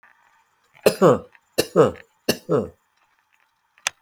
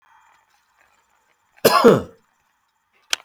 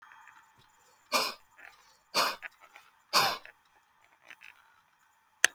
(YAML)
three_cough_length: 4.0 s
three_cough_amplitude: 28872
three_cough_signal_mean_std_ratio: 0.32
cough_length: 3.2 s
cough_amplitude: 30086
cough_signal_mean_std_ratio: 0.26
exhalation_length: 5.5 s
exhalation_amplitude: 25345
exhalation_signal_mean_std_ratio: 0.27
survey_phase: beta (2021-08-13 to 2022-03-07)
age: 65+
gender: Male
wearing_mask: 'No'
symptom_cough_any: true
smoker_status: Ex-smoker
respiratory_condition_asthma: false
respiratory_condition_other: false
recruitment_source: REACT
submission_delay: 1 day
covid_test_result: Negative
covid_test_method: RT-qPCR